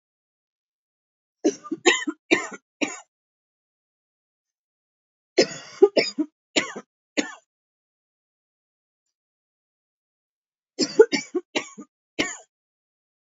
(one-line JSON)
{"three_cough_length": "13.2 s", "three_cough_amplitude": 26265, "three_cough_signal_mean_std_ratio": 0.24, "survey_phase": "beta (2021-08-13 to 2022-03-07)", "age": "45-64", "gender": "Female", "wearing_mask": "No", "symptom_cough_any": true, "symptom_runny_or_blocked_nose": true, "symptom_sore_throat": true, "symptom_diarrhoea": true, "symptom_fatigue": true, "symptom_headache": true, "symptom_other": true, "symptom_onset": "3 days", "smoker_status": "Never smoked", "respiratory_condition_asthma": false, "respiratory_condition_other": false, "recruitment_source": "Test and Trace", "submission_delay": "2 days", "covid_test_result": "Positive", "covid_test_method": "RT-qPCR", "covid_ct_value": 16.5, "covid_ct_gene": "ORF1ab gene"}